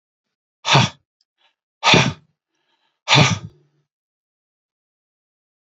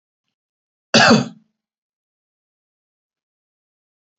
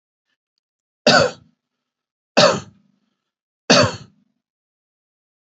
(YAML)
exhalation_length: 5.7 s
exhalation_amplitude: 32768
exhalation_signal_mean_std_ratio: 0.29
cough_length: 4.2 s
cough_amplitude: 30280
cough_signal_mean_std_ratio: 0.21
three_cough_length: 5.5 s
three_cough_amplitude: 31699
three_cough_signal_mean_std_ratio: 0.27
survey_phase: beta (2021-08-13 to 2022-03-07)
age: 65+
gender: Male
wearing_mask: 'No'
symptom_none: true
smoker_status: Never smoked
respiratory_condition_asthma: false
respiratory_condition_other: false
recruitment_source: REACT
submission_delay: 1 day
covid_test_result: Negative
covid_test_method: RT-qPCR